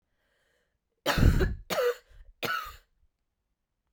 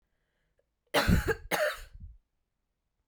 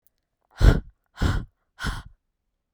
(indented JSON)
{
  "three_cough_length": "3.9 s",
  "three_cough_amplitude": 13024,
  "three_cough_signal_mean_std_ratio": 0.38,
  "cough_length": "3.1 s",
  "cough_amplitude": 9896,
  "cough_signal_mean_std_ratio": 0.38,
  "exhalation_length": "2.7 s",
  "exhalation_amplitude": 24713,
  "exhalation_signal_mean_std_ratio": 0.31,
  "survey_phase": "beta (2021-08-13 to 2022-03-07)",
  "age": "18-44",
  "gender": "Female",
  "wearing_mask": "No",
  "symptom_cough_any": true,
  "symptom_runny_or_blocked_nose": true,
  "symptom_sore_throat": true,
  "symptom_diarrhoea": true,
  "symptom_fatigue": true,
  "symptom_headache": true,
  "symptom_onset": "2 days",
  "smoker_status": "Never smoked",
  "respiratory_condition_asthma": false,
  "respiratory_condition_other": false,
  "recruitment_source": "Test and Trace",
  "submission_delay": "1 day",
  "covid_test_result": "Positive",
  "covid_test_method": "RT-qPCR",
  "covid_ct_value": 22.6,
  "covid_ct_gene": "ORF1ab gene",
  "covid_ct_mean": 23.2,
  "covid_viral_load": "24000 copies/ml",
  "covid_viral_load_category": "Low viral load (10K-1M copies/ml)"
}